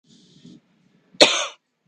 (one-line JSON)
{"cough_length": "1.9 s", "cough_amplitude": 32768, "cough_signal_mean_std_ratio": 0.25, "survey_phase": "beta (2021-08-13 to 2022-03-07)", "age": "45-64", "gender": "Female", "wearing_mask": "No", "symptom_none": true, "smoker_status": "Current smoker (1 to 10 cigarettes per day)", "respiratory_condition_asthma": false, "respiratory_condition_other": false, "recruitment_source": "REACT", "submission_delay": "1 day", "covid_test_result": "Negative", "covid_test_method": "RT-qPCR", "influenza_a_test_result": "Negative", "influenza_b_test_result": "Negative"}